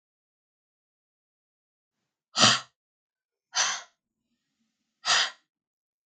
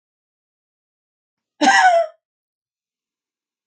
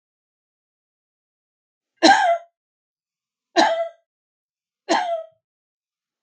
exhalation_length: 6.1 s
exhalation_amplitude: 18208
exhalation_signal_mean_std_ratio: 0.25
cough_length: 3.7 s
cough_amplitude: 26918
cough_signal_mean_std_ratio: 0.29
three_cough_length: 6.2 s
three_cough_amplitude: 32753
three_cough_signal_mean_std_ratio: 0.3
survey_phase: beta (2021-08-13 to 2022-03-07)
age: 65+
gender: Female
wearing_mask: 'No'
symptom_none: true
smoker_status: Never smoked
respiratory_condition_asthma: false
respiratory_condition_other: false
recruitment_source: REACT
submission_delay: 2 days
covid_test_result: Negative
covid_test_method: RT-qPCR
influenza_a_test_result: Negative
influenza_b_test_result: Negative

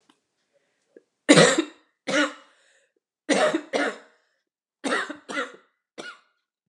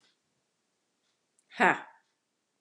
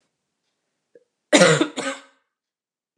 three_cough_length: 6.7 s
three_cough_amplitude: 28669
three_cough_signal_mean_std_ratio: 0.34
exhalation_length: 2.6 s
exhalation_amplitude: 13774
exhalation_signal_mean_std_ratio: 0.19
cough_length: 3.0 s
cough_amplitude: 32767
cough_signal_mean_std_ratio: 0.29
survey_phase: beta (2021-08-13 to 2022-03-07)
age: 18-44
gender: Female
wearing_mask: 'No'
symptom_runny_or_blocked_nose: true
symptom_headache: true
symptom_other: true
smoker_status: Never smoked
respiratory_condition_asthma: true
respiratory_condition_other: false
recruitment_source: Test and Trace
submission_delay: 2 days
covid_test_result: Positive
covid_test_method: RT-qPCR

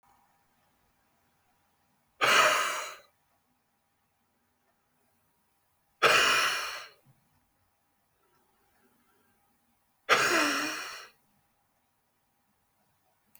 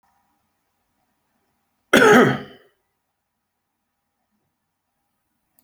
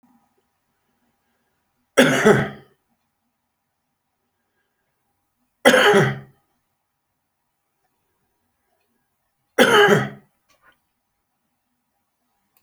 exhalation_length: 13.4 s
exhalation_amplitude: 11449
exhalation_signal_mean_std_ratio: 0.31
cough_length: 5.6 s
cough_amplitude: 27821
cough_signal_mean_std_ratio: 0.22
three_cough_length: 12.6 s
three_cough_amplitude: 32767
three_cough_signal_mean_std_ratio: 0.27
survey_phase: beta (2021-08-13 to 2022-03-07)
age: 45-64
gender: Male
wearing_mask: 'No'
symptom_cough_any: true
symptom_fatigue: true
symptom_headache: true
symptom_change_to_sense_of_smell_or_taste: true
symptom_onset: 6 days
smoker_status: Current smoker (1 to 10 cigarettes per day)
respiratory_condition_asthma: false
respiratory_condition_other: true
recruitment_source: Test and Trace
submission_delay: 1 day
covid_test_result: Positive
covid_test_method: RT-qPCR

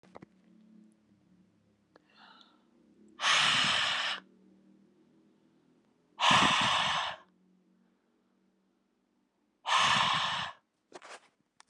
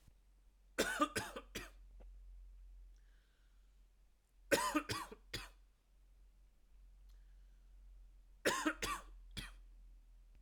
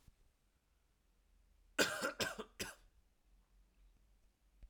exhalation_length: 11.7 s
exhalation_amplitude: 10179
exhalation_signal_mean_std_ratio: 0.41
three_cough_length: 10.4 s
three_cough_amplitude: 3668
three_cough_signal_mean_std_ratio: 0.41
cough_length: 4.7 s
cough_amplitude: 4072
cough_signal_mean_std_ratio: 0.3
survey_phase: alpha (2021-03-01 to 2021-08-12)
age: 18-44
gender: Male
wearing_mask: 'No'
symptom_cough_any: true
symptom_fatigue: true
symptom_headache: true
symptom_onset: 4 days
smoker_status: Never smoked
respiratory_condition_asthma: false
respiratory_condition_other: false
recruitment_source: Test and Trace
submission_delay: 2 days
covid_test_result: Positive
covid_test_method: RT-qPCR
covid_ct_value: 20.2
covid_ct_gene: ORF1ab gene
covid_ct_mean: 20.6
covid_viral_load: 170000 copies/ml
covid_viral_load_category: Low viral load (10K-1M copies/ml)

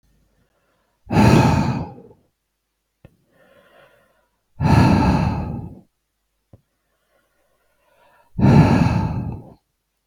exhalation_length: 10.1 s
exhalation_amplitude: 29691
exhalation_signal_mean_std_ratio: 0.41
survey_phase: beta (2021-08-13 to 2022-03-07)
age: 65+
gender: Male
wearing_mask: 'No'
symptom_none: true
smoker_status: Never smoked
respiratory_condition_asthma: false
respiratory_condition_other: false
recruitment_source: REACT
submission_delay: 2 days
covid_test_result: Negative
covid_test_method: RT-qPCR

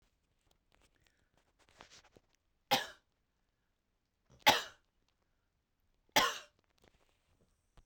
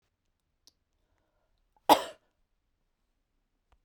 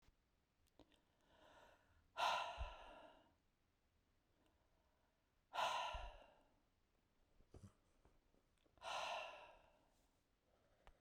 three_cough_length: 7.9 s
three_cough_amplitude: 8617
three_cough_signal_mean_std_ratio: 0.18
cough_length: 3.8 s
cough_amplitude: 17664
cough_signal_mean_std_ratio: 0.13
exhalation_length: 11.0 s
exhalation_amplitude: 1161
exhalation_signal_mean_std_ratio: 0.35
survey_phase: beta (2021-08-13 to 2022-03-07)
age: 45-64
gender: Female
wearing_mask: 'No'
symptom_none: true
smoker_status: Prefer not to say
respiratory_condition_asthma: false
respiratory_condition_other: false
recruitment_source: REACT
submission_delay: 1 day
covid_test_result: Negative
covid_test_method: RT-qPCR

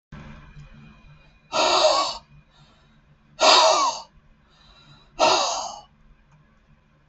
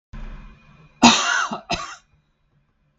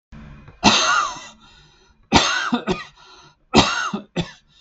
exhalation_length: 7.1 s
exhalation_amplitude: 26056
exhalation_signal_mean_std_ratio: 0.41
cough_length: 3.0 s
cough_amplitude: 32768
cough_signal_mean_std_ratio: 0.35
three_cough_length: 4.6 s
three_cough_amplitude: 32768
three_cough_signal_mean_std_ratio: 0.47
survey_phase: beta (2021-08-13 to 2022-03-07)
age: 45-64
gender: Male
wearing_mask: 'No'
symptom_none: true
smoker_status: Never smoked
respiratory_condition_asthma: false
respiratory_condition_other: false
recruitment_source: REACT
submission_delay: 2 days
covid_test_result: Negative
covid_test_method: RT-qPCR
influenza_a_test_result: Negative
influenza_b_test_result: Negative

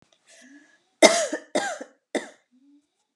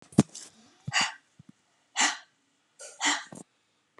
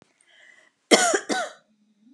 three_cough_length: 3.2 s
three_cough_amplitude: 32339
three_cough_signal_mean_std_ratio: 0.28
exhalation_length: 4.0 s
exhalation_amplitude: 18034
exhalation_signal_mean_std_ratio: 0.3
cough_length: 2.1 s
cough_amplitude: 32722
cough_signal_mean_std_ratio: 0.34
survey_phase: alpha (2021-03-01 to 2021-08-12)
age: 45-64
gender: Female
wearing_mask: 'No'
symptom_none: true
smoker_status: Never smoked
respiratory_condition_asthma: false
respiratory_condition_other: false
recruitment_source: REACT
submission_delay: 2 days
covid_test_result: Negative
covid_test_method: RT-qPCR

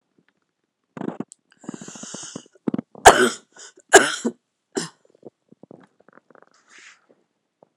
cough_length: 7.8 s
cough_amplitude: 32768
cough_signal_mean_std_ratio: 0.21
survey_phase: beta (2021-08-13 to 2022-03-07)
age: 45-64
gender: Female
wearing_mask: 'No'
symptom_new_continuous_cough: true
symptom_runny_or_blocked_nose: true
symptom_sore_throat: true
symptom_diarrhoea: true
symptom_fatigue: true
symptom_fever_high_temperature: true
symptom_headache: true
symptom_onset: 8 days
smoker_status: Never smoked
respiratory_condition_asthma: false
respiratory_condition_other: false
recruitment_source: Test and Trace
submission_delay: 2 days
covid_test_result: Negative
covid_test_method: RT-qPCR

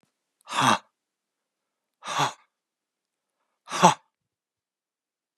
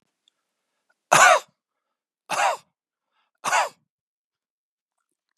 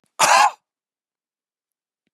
exhalation_length: 5.4 s
exhalation_amplitude: 29970
exhalation_signal_mean_std_ratio: 0.24
three_cough_length: 5.4 s
three_cough_amplitude: 31672
three_cough_signal_mean_std_ratio: 0.27
cough_length: 2.1 s
cough_amplitude: 27255
cough_signal_mean_std_ratio: 0.31
survey_phase: beta (2021-08-13 to 2022-03-07)
age: 65+
gender: Male
wearing_mask: 'No'
symptom_none: true
smoker_status: Ex-smoker
respiratory_condition_asthma: false
respiratory_condition_other: false
recruitment_source: REACT
submission_delay: 2 days
covid_test_result: Negative
covid_test_method: RT-qPCR
influenza_a_test_result: Negative
influenza_b_test_result: Negative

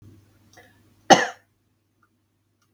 cough_length: 2.7 s
cough_amplitude: 32768
cough_signal_mean_std_ratio: 0.17
survey_phase: beta (2021-08-13 to 2022-03-07)
age: 45-64
gender: Female
wearing_mask: 'No'
symptom_none: true
smoker_status: Never smoked
respiratory_condition_asthma: false
respiratory_condition_other: false
recruitment_source: REACT
submission_delay: 1 day
covid_test_result: Negative
covid_test_method: RT-qPCR
influenza_a_test_result: Unknown/Void
influenza_b_test_result: Unknown/Void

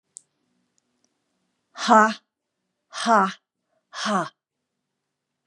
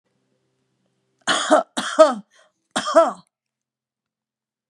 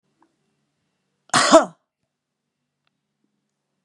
exhalation_length: 5.5 s
exhalation_amplitude: 30110
exhalation_signal_mean_std_ratio: 0.28
three_cough_length: 4.7 s
three_cough_amplitude: 32241
three_cough_signal_mean_std_ratio: 0.31
cough_length: 3.8 s
cough_amplitude: 32767
cough_signal_mean_std_ratio: 0.2
survey_phase: beta (2021-08-13 to 2022-03-07)
age: 45-64
gender: Female
wearing_mask: 'No'
symptom_none: true
smoker_status: Never smoked
respiratory_condition_asthma: false
respiratory_condition_other: false
recruitment_source: REACT
submission_delay: 1 day
covid_test_result: Negative
covid_test_method: RT-qPCR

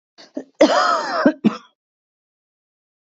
cough_length: 3.2 s
cough_amplitude: 27142
cough_signal_mean_std_ratio: 0.38
survey_phase: beta (2021-08-13 to 2022-03-07)
age: 45-64
gender: Female
wearing_mask: 'No'
symptom_cough_any: true
symptom_runny_or_blocked_nose: true
smoker_status: Never smoked
respiratory_condition_asthma: false
respiratory_condition_other: false
recruitment_source: Test and Trace
submission_delay: 2 days
covid_test_result: Negative
covid_test_method: RT-qPCR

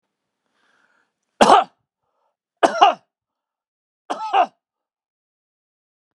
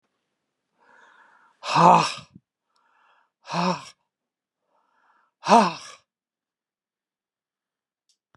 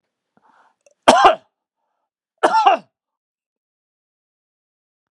three_cough_length: 6.1 s
three_cough_amplitude: 32767
three_cough_signal_mean_std_ratio: 0.25
exhalation_length: 8.4 s
exhalation_amplitude: 26315
exhalation_signal_mean_std_ratio: 0.24
cough_length: 5.1 s
cough_amplitude: 32768
cough_signal_mean_std_ratio: 0.26
survey_phase: beta (2021-08-13 to 2022-03-07)
age: 65+
gender: Male
wearing_mask: 'No'
symptom_runny_or_blocked_nose: true
symptom_shortness_of_breath: true
smoker_status: Ex-smoker
respiratory_condition_asthma: false
respiratory_condition_other: false
recruitment_source: Test and Trace
submission_delay: 1 day
covid_test_result: Positive
covid_test_method: RT-qPCR
covid_ct_value: 19.0
covid_ct_gene: N gene
covid_ct_mean: 20.1
covid_viral_load: 250000 copies/ml
covid_viral_load_category: Low viral load (10K-1M copies/ml)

